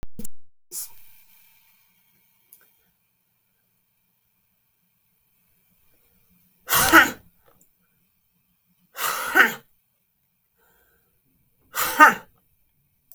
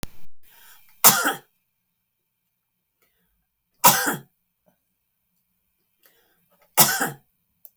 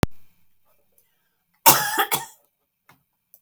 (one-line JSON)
{"exhalation_length": "13.1 s", "exhalation_amplitude": 32766, "exhalation_signal_mean_std_ratio": 0.25, "three_cough_length": "7.8 s", "three_cough_amplitude": 32768, "three_cough_signal_mean_std_ratio": 0.27, "cough_length": "3.4 s", "cough_amplitude": 32768, "cough_signal_mean_std_ratio": 0.29, "survey_phase": "beta (2021-08-13 to 2022-03-07)", "age": "65+", "gender": "Female", "wearing_mask": "No", "symptom_none": true, "smoker_status": "Ex-smoker", "respiratory_condition_asthma": false, "respiratory_condition_other": false, "recruitment_source": "REACT", "submission_delay": "2 days", "covid_test_result": "Negative", "covid_test_method": "RT-qPCR", "influenza_a_test_result": "Negative", "influenza_b_test_result": "Negative"}